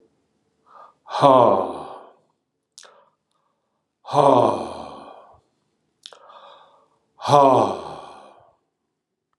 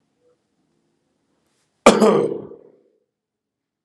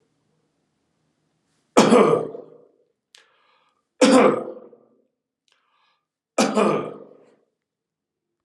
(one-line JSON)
{"exhalation_length": "9.4 s", "exhalation_amplitude": 30826, "exhalation_signal_mean_std_ratio": 0.33, "cough_length": "3.8 s", "cough_amplitude": 32768, "cough_signal_mean_std_ratio": 0.26, "three_cough_length": "8.4 s", "three_cough_amplitude": 32767, "three_cough_signal_mean_std_ratio": 0.32, "survey_phase": "alpha (2021-03-01 to 2021-08-12)", "age": "45-64", "gender": "Male", "wearing_mask": "No", "symptom_none": true, "smoker_status": "Never smoked", "respiratory_condition_asthma": false, "respiratory_condition_other": false, "recruitment_source": "Test and Trace", "submission_delay": "0 days", "covid_test_result": "Negative", "covid_test_method": "LFT"}